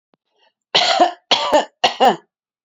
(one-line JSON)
{"three_cough_length": "2.6 s", "three_cough_amplitude": 29639, "three_cough_signal_mean_std_ratio": 0.47, "survey_phase": "beta (2021-08-13 to 2022-03-07)", "age": "45-64", "gender": "Female", "wearing_mask": "No", "symptom_runny_or_blocked_nose": true, "smoker_status": "Never smoked", "respiratory_condition_asthma": false, "respiratory_condition_other": false, "recruitment_source": "REACT", "submission_delay": "1 day", "covid_test_result": "Negative", "covid_test_method": "RT-qPCR"}